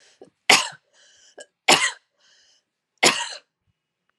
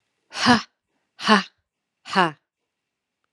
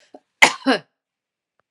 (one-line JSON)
{"three_cough_length": "4.2 s", "three_cough_amplitude": 32767, "three_cough_signal_mean_std_ratio": 0.27, "exhalation_length": "3.3 s", "exhalation_amplitude": 32202, "exhalation_signal_mean_std_ratio": 0.29, "cough_length": "1.7 s", "cough_amplitude": 32768, "cough_signal_mean_std_ratio": 0.25, "survey_phase": "alpha (2021-03-01 to 2021-08-12)", "age": "45-64", "gender": "Female", "wearing_mask": "No", "symptom_cough_any": true, "symptom_fatigue": true, "symptom_change_to_sense_of_smell_or_taste": true, "smoker_status": "Ex-smoker", "respiratory_condition_asthma": false, "respiratory_condition_other": false, "recruitment_source": "Test and Trace", "submission_delay": "2 days", "covid_test_result": "Positive", "covid_test_method": "RT-qPCR"}